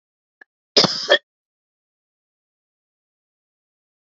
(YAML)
cough_length: 4.1 s
cough_amplitude: 32435
cough_signal_mean_std_ratio: 0.19
survey_phase: beta (2021-08-13 to 2022-03-07)
age: 45-64
gender: Female
wearing_mask: 'No'
symptom_cough_any: true
smoker_status: Never smoked
respiratory_condition_asthma: false
respiratory_condition_other: false
recruitment_source: Test and Trace
submission_delay: 1 day
covid_test_result: Negative
covid_test_method: LFT